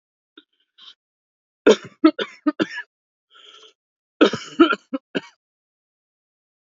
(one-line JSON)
{"cough_length": "6.7 s", "cough_amplitude": 27805, "cough_signal_mean_std_ratio": 0.24, "survey_phase": "alpha (2021-03-01 to 2021-08-12)", "age": "18-44", "gender": "Female", "wearing_mask": "No", "symptom_none": true, "smoker_status": "Ex-smoker", "respiratory_condition_asthma": false, "respiratory_condition_other": false, "recruitment_source": "REACT", "submission_delay": "1 day", "covid_test_result": "Negative", "covid_test_method": "RT-qPCR"}